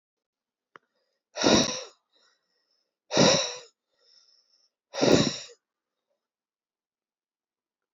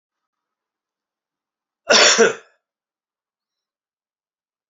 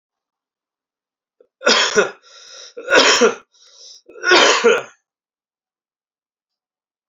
{"exhalation_length": "7.9 s", "exhalation_amplitude": 18250, "exhalation_signal_mean_std_ratio": 0.29, "cough_length": "4.7 s", "cough_amplitude": 31654, "cough_signal_mean_std_ratio": 0.24, "three_cough_length": "7.1 s", "three_cough_amplitude": 30810, "three_cough_signal_mean_std_ratio": 0.37, "survey_phase": "beta (2021-08-13 to 2022-03-07)", "age": "18-44", "gender": "Male", "wearing_mask": "No", "symptom_runny_or_blocked_nose": true, "symptom_onset": "3 days", "smoker_status": "Never smoked", "respiratory_condition_asthma": false, "respiratory_condition_other": false, "recruitment_source": "Test and Trace", "submission_delay": "2 days", "covid_test_result": "Positive", "covid_test_method": "RT-qPCR"}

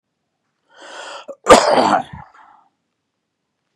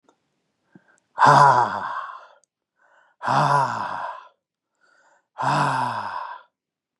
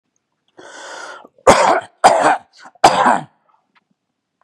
{"cough_length": "3.8 s", "cough_amplitude": 32768, "cough_signal_mean_std_ratio": 0.3, "exhalation_length": "7.0 s", "exhalation_amplitude": 26955, "exhalation_signal_mean_std_ratio": 0.44, "three_cough_length": "4.4 s", "three_cough_amplitude": 32768, "three_cough_signal_mean_std_ratio": 0.39, "survey_phase": "beta (2021-08-13 to 2022-03-07)", "age": "45-64", "gender": "Male", "wearing_mask": "No", "symptom_runny_or_blocked_nose": true, "symptom_onset": "6 days", "smoker_status": "Ex-smoker", "respiratory_condition_asthma": false, "respiratory_condition_other": false, "recruitment_source": "Test and Trace", "submission_delay": "2 days", "covid_test_result": "Positive", "covid_test_method": "RT-qPCR", "covid_ct_value": 16.6, "covid_ct_gene": "N gene"}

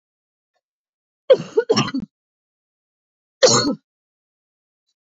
{"three_cough_length": "5.0 s", "three_cough_amplitude": 29529, "three_cough_signal_mean_std_ratio": 0.28, "survey_phase": "beta (2021-08-13 to 2022-03-07)", "age": "45-64", "gender": "Female", "wearing_mask": "No", "symptom_cough_any": true, "symptom_sore_throat": true, "symptom_fatigue": true, "symptom_headache": true, "symptom_onset": "3 days", "smoker_status": "Ex-smoker", "respiratory_condition_asthma": true, "respiratory_condition_other": false, "recruitment_source": "Test and Trace", "submission_delay": "2 days", "covid_test_result": "Positive", "covid_test_method": "RT-qPCR"}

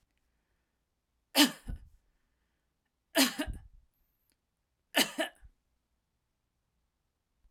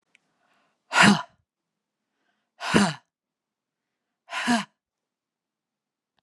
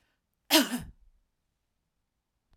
{"three_cough_length": "7.5 s", "three_cough_amplitude": 11630, "three_cough_signal_mean_std_ratio": 0.23, "exhalation_length": "6.2 s", "exhalation_amplitude": 28483, "exhalation_signal_mean_std_ratio": 0.26, "cough_length": "2.6 s", "cough_amplitude": 13256, "cough_signal_mean_std_ratio": 0.23, "survey_phase": "beta (2021-08-13 to 2022-03-07)", "age": "45-64", "gender": "Female", "wearing_mask": "No", "symptom_none": true, "smoker_status": "Never smoked", "respiratory_condition_asthma": false, "respiratory_condition_other": false, "recruitment_source": "REACT", "submission_delay": "1 day", "covid_test_result": "Negative", "covid_test_method": "RT-qPCR"}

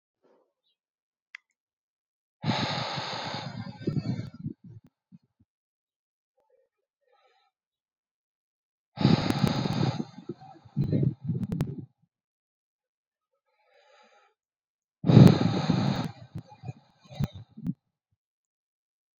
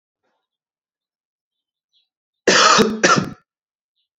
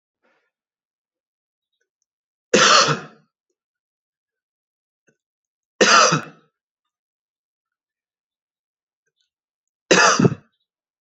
{"exhalation_length": "19.2 s", "exhalation_amplitude": 25492, "exhalation_signal_mean_std_ratio": 0.31, "cough_length": "4.2 s", "cough_amplitude": 28948, "cough_signal_mean_std_ratio": 0.33, "three_cough_length": "11.0 s", "three_cough_amplitude": 30219, "three_cough_signal_mean_std_ratio": 0.26, "survey_phase": "alpha (2021-03-01 to 2021-08-12)", "age": "18-44", "gender": "Male", "wearing_mask": "No", "symptom_cough_any": true, "symptom_headache": true, "symptom_change_to_sense_of_smell_or_taste": true, "symptom_onset": "2 days", "smoker_status": "Never smoked", "respiratory_condition_asthma": true, "respiratory_condition_other": false, "recruitment_source": "Test and Trace", "submission_delay": "1 day", "covid_test_result": "Positive", "covid_test_method": "RT-qPCR", "covid_ct_value": 17.3, "covid_ct_gene": "ORF1ab gene", "covid_ct_mean": 17.8, "covid_viral_load": "1500000 copies/ml", "covid_viral_load_category": "High viral load (>1M copies/ml)"}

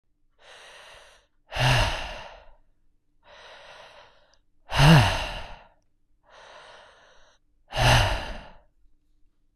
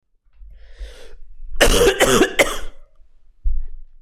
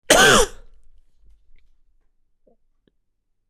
{"exhalation_length": "9.6 s", "exhalation_amplitude": 25588, "exhalation_signal_mean_std_ratio": 0.34, "three_cough_length": "4.0 s", "three_cough_amplitude": 26028, "three_cough_signal_mean_std_ratio": 0.57, "cough_length": "3.5 s", "cough_amplitude": 26028, "cough_signal_mean_std_ratio": 0.29, "survey_phase": "beta (2021-08-13 to 2022-03-07)", "age": "18-44", "gender": "Male", "wearing_mask": "No", "symptom_none": true, "symptom_onset": "6 days", "smoker_status": "Never smoked", "respiratory_condition_asthma": false, "respiratory_condition_other": false, "recruitment_source": "Test and Trace", "submission_delay": "1 day", "covid_test_result": "Positive", "covid_test_method": "RT-qPCR", "covid_ct_value": 24.7, "covid_ct_gene": "N gene"}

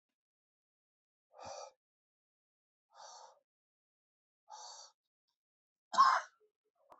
{"exhalation_length": "7.0 s", "exhalation_amplitude": 5906, "exhalation_signal_mean_std_ratio": 0.19, "survey_phase": "beta (2021-08-13 to 2022-03-07)", "age": "45-64", "gender": "Male", "wearing_mask": "No", "symptom_cough_any": true, "symptom_runny_or_blocked_nose": true, "symptom_headache": true, "symptom_loss_of_taste": true, "smoker_status": "Ex-smoker", "respiratory_condition_asthma": false, "respiratory_condition_other": false, "recruitment_source": "Test and Trace", "submission_delay": "2 days", "covid_test_result": "Positive", "covid_test_method": "LFT"}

